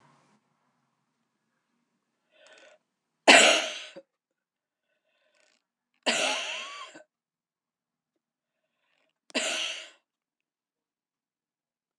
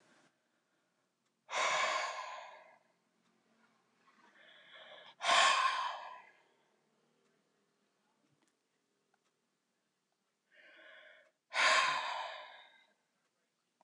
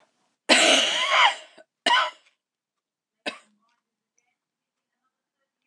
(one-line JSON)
{"three_cough_length": "12.0 s", "three_cough_amplitude": 25859, "three_cough_signal_mean_std_ratio": 0.22, "exhalation_length": "13.8 s", "exhalation_amplitude": 5493, "exhalation_signal_mean_std_ratio": 0.33, "cough_length": "5.7 s", "cough_amplitude": 24396, "cough_signal_mean_std_ratio": 0.35, "survey_phase": "beta (2021-08-13 to 2022-03-07)", "age": "65+", "gender": "Female", "wearing_mask": "No", "symptom_runny_or_blocked_nose": true, "smoker_status": "Never smoked", "respiratory_condition_asthma": false, "respiratory_condition_other": false, "recruitment_source": "REACT", "submission_delay": "4 days", "covid_test_result": "Negative", "covid_test_method": "RT-qPCR", "influenza_a_test_result": "Negative", "influenza_b_test_result": "Negative"}